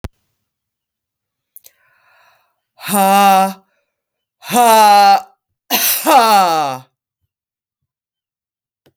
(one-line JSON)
{"exhalation_length": "9.0 s", "exhalation_amplitude": 32768, "exhalation_signal_mean_std_ratio": 0.44, "survey_phase": "beta (2021-08-13 to 2022-03-07)", "age": "45-64", "gender": "Female", "wearing_mask": "No", "symptom_cough_any": true, "symptom_runny_or_blocked_nose": true, "symptom_sore_throat": true, "symptom_diarrhoea": true, "symptom_fatigue": true, "symptom_headache": true, "symptom_change_to_sense_of_smell_or_taste": true, "smoker_status": "Ex-smoker", "respiratory_condition_asthma": false, "respiratory_condition_other": false, "recruitment_source": "Test and Trace", "submission_delay": "0 days", "covid_test_result": "Positive", "covid_test_method": "LFT"}